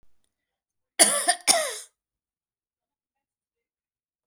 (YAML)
cough_length: 4.3 s
cough_amplitude: 30958
cough_signal_mean_std_ratio: 0.26
survey_phase: beta (2021-08-13 to 2022-03-07)
age: 45-64
gender: Female
wearing_mask: 'No'
symptom_none: true
smoker_status: Ex-smoker
respiratory_condition_asthma: false
respiratory_condition_other: false
recruitment_source: REACT
submission_delay: 5 days
covid_test_result: Negative
covid_test_method: RT-qPCR